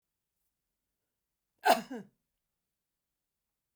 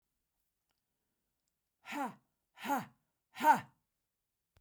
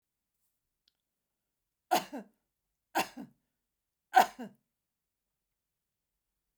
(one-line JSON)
{"cough_length": "3.8 s", "cough_amplitude": 8355, "cough_signal_mean_std_ratio": 0.17, "exhalation_length": "4.6 s", "exhalation_amplitude": 6755, "exhalation_signal_mean_std_ratio": 0.24, "three_cough_length": "6.6 s", "three_cough_amplitude": 12527, "three_cough_signal_mean_std_ratio": 0.17, "survey_phase": "beta (2021-08-13 to 2022-03-07)", "age": "65+", "gender": "Female", "wearing_mask": "No", "symptom_cough_any": true, "symptom_onset": "12 days", "smoker_status": "Never smoked", "respiratory_condition_asthma": false, "respiratory_condition_other": false, "recruitment_source": "REACT", "submission_delay": "2 days", "covid_test_result": "Negative", "covid_test_method": "RT-qPCR"}